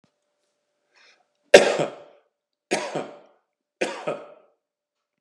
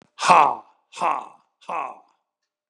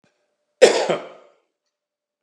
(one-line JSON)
{"three_cough_length": "5.2 s", "three_cough_amplitude": 32768, "three_cough_signal_mean_std_ratio": 0.22, "exhalation_length": "2.7 s", "exhalation_amplitude": 32768, "exhalation_signal_mean_std_ratio": 0.34, "cough_length": "2.2 s", "cough_amplitude": 32768, "cough_signal_mean_std_ratio": 0.27, "survey_phase": "beta (2021-08-13 to 2022-03-07)", "age": "45-64", "gender": "Male", "wearing_mask": "No", "symptom_none": true, "smoker_status": "Never smoked", "respiratory_condition_asthma": false, "respiratory_condition_other": false, "recruitment_source": "REACT", "submission_delay": "1 day", "covid_test_result": "Negative", "covid_test_method": "RT-qPCR", "influenza_a_test_result": "Negative", "influenza_b_test_result": "Negative"}